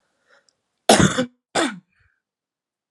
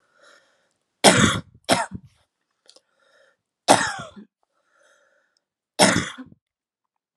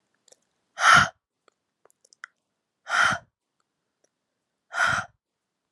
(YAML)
cough_length: 2.9 s
cough_amplitude: 32498
cough_signal_mean_std_ratio: 0.3
three_cough_length: 7.2 s
three_cough_amplitude: 32767
three_cough_signal_mean_std_ratio: 0.28
exhalation_length: 5.7 s
exhalation_amplitude: 23184
exhalation_signal_mean_std_ratio: 0.28
survey_phase: alpha (2021-03-01 to 2021-08-12)
age: 18-44
gender: Female
wearing_mask: 'No'
symptom_cough_any: true
symptom_shortness_of_breath: true
symptom_onset: 4 days
smoker_status: Never smoked
respiratory_condition_asthma: false
respiratory_condition_other: false
recruitment_source: Test and Trace
submission_delay: 2 days
covid_test_result: Positive
covid_test_method: RT-qPCR
covid_ct_value: 16.6
covid_ct_gene: ORF1ab gene
covid_ct_mean: 16.6
covid_viral_load: 3500000 copies/ml
covid_viral_load_category: High viral load (>1M copies/ml)